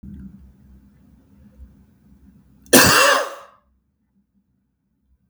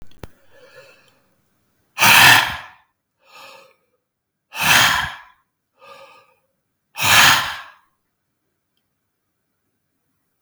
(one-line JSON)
{"cough_length": "5.3 s", "cough_amplitude": 32768, "cough_signal_mean_std_ratio": 0.28, "exhalation_length": "10.4 s", "exhalation_amplitude": 32768, "exhalation_signal_mean_std_ratio": 0.31, "survey_phase": "beta (2021-08-13 to 2022-03-07)", "age": "45-64", "gender": "Male", "wearing_mask": "No", "symptom_none": true, "smoker_status": "Ex-smoker", "respiratory_condition_asthma": false, "respiratory_condition_other": false, "recruitment_source": "REACT", "submission_delay": "2 days", "covid_test_result": "Negative", "covid_test_method": "RT-qPCR", "influenza_a_test_result": "Negative", "influenza_b_test_result": "Negative"}